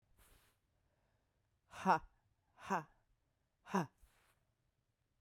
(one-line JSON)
{"exhalation_length": "5.2 s", "exhalation_amplitude": 3508, "exhalation_signal_mean_std_ratio": 0.23, "survey_phase": "beta (2021-08-13 to 2022-03-07)", "age": "45-64", "gender": "Female", "wearing_mask": "No", "symptom_cough_any": true, "symptom_runny_or_blocked_nose": true, "symptom_sore_throat": true, "symptom_fatigue": true, "symptom_fever_high_temperature": true, "symptom_headache": true, "symptom_change_to_sense_of_smell_or_taste": true, "symptom_other": true, "symptom_onset": "3 days", "smoker_status": "Ex-smoker", "respiratory_condition_asthma": false, "respiratory_condition_other": false, "recruitment_source": "Test and Trace", "submission_delay": "2 days", "covid_test_result": "Positive", "covid_test_method": "RT-qPCR", "covid_ct_value": 16.3, "covid_ct_gene": "ORF1ab gene", "covid_ct_mean": 16.7, "covid_viral_load": "3200000 copies/ml", "covid_viral_load_category": "High viral load (>1M copies/ml)"}